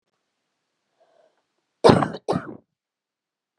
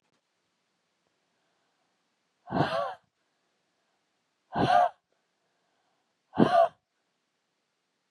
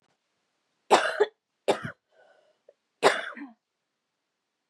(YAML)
cough_length: 3.6 s
cough_amplitude: 32427
cough_signal_mean_std_ratio: 0.22
exhalation_length: 8.1 s
exhalation_amplitude: 16092
exhalation_signal_mean_std_ratio: 0.27
three_cough_length: 4.7 s
three_cough_amplitude: 24433
three_cough_signal_mean_std_ratio: 0.26
survey_phase: beta (2021-08-13 to 2022-03-07)
age: 18-44
gender: Female
wearing_mask: 'No'
symptom_cough_any: true
symptom_headache: true
symptom_other: true
symptom_onset: 3 days
smoker_status: Ex-smoker
respiratory_condition_asthma: false
respiratory_condition_other: false
recruitment_source: Test and Trace
submission_delay: 2 days
covid_test_result: Positive
covid_test_method: ePCR